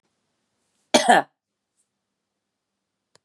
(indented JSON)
{
  "cough_length": "3.2 s",
  "cough_amplitude": 28617,
  "cough_signal_mean_std_ratio": 0.21,
  "survey_phase": "beta (2021-08-13 to 2022-03-07)",
  "age": "45-64",
  "gender": "Female",
  "wearing_mask": "No",
  "symptom_fatigue": true,
  "symptom_other": true,
  "symptom_onset": "3 days",
  "smoker_status": "Never smoked",
  "respiratory_condition_asthma": false,
  "respiratory_condition_other": false,
  "recruitment_source": "Test and Trace",
  "submission_delay": "2 days",
  "covid_test_result": "Positive",
  "covid_test_method": "RT-qPCR",
  "covid_ct_value": 15.5,
  "covid_ct_gene": "N gene",
  "covid_ct_mean": 15.5,
  "covid_viral_load": "8000000 copies/ml",
  "covid_viral_load_category": "High viral load (>1M copies/ml)"
}